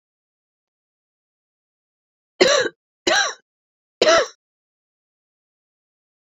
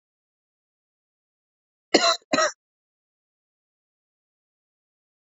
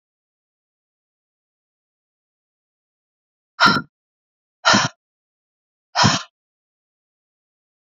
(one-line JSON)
{"three_cough_length": "6.2 s", "three_cough_amplitude": 27279, "three_cough_signal_mean_std_ratio": 0.27, "cough_length": "5.4 s", "cough_amplitude": 25598, "cough_signal_mean_std_ratio": 0.2, "exhalation_length": "7.9 s", "exhalation_amplitude": 29501, "exhalation_signal_mean_std_ratio": 0.22, "survey_phase": "beta (2021-08-13 to 2022-03-07)", "age": "45-64", "gender": "Female", "wearing_mask": "No", "symptom_cough_any": true, "symptom_shortness_of_breath": true, "symptom_fatigue": true, "symptom_change_to_sense_of_smell_or_taste": true, "symptom_loss_of_taste": true, "symptom_onset": "5 days", "smoker_status": "Never smoked", "respiratory_condition_asthma": false, "respiratory_condition_other": false, "recruitment_source": "Test and Trace", "submission_delay": "2 days", "covid_test_result": "Positive", "covid_test_method": "ePCR"}